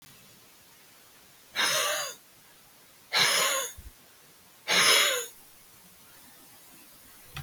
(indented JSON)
{
  "exhalation_length": "7.4 s",
  "exhalation_amplitude": 12538,
  "exhalation_signal_mean_std_ratio": 0.43,
  "survey_phase": "beta (2021-08-13 to 2022-03-07)",
  "age": "65+",
  "gender": "Male",
  "wearing_mask": "No",
  "symptom_none": true,
  "smoker_status": "Never smoked",
  "respiratory_condition_asthma": false,
  "respiratory_condition_other": false,
  "recruitment_source": "REACT",
  "submission_delay": "1 day",
  "covid_test_result": "Negative",
  "covid_test_method": "RT-qPCR",
  "influenza_a_test_result": "Negative",
  "influenza_b_test_result": "Negative"
}